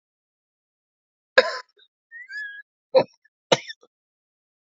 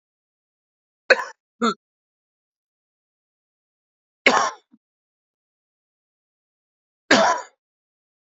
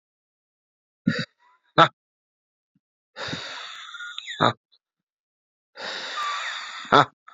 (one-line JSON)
{"cough_length": "4.6 s", "cough_amplitude": 28399, "cough_signal_mean_std_ratio": 0.21, "three_cough_length": "8.3 s", "three_cough_amplitude": 28427, "three_cough_signal_mean_std_ratio": 0.22, "exhalation_length": "7.3 s", "exhalation_amplitude": 27348, "exhalation_signal_mean_std_ratio": 0.29, "survey_phase": "beta (2021-08-13 to 2022-03-07)", "age": "18-44", "gender": "Male", "wearing_mask": "No", "symptom_cough_any": true, "symptom_sore_throat": true, "symptom_fatigue": true, "symptom_headache": true, "smoker_status": "Never smoked", "respiratory_condition_asthma": false, "respiratory_condition_other": false, "recruitment_source": "Test and Trace", "submission_delay": "2 days", "covid_test_result": "Positive", "covid_test_method": "RT-qPCR", "covid_ct_value": 20.7, "covid_ct_gene": "ORF1ab gene", "covid_ct_mean": 21.1, "covid_viral_load": "120000 copies/ml", "covid_viral_load_category": "Low viral load (10K-1M copies/ml)"}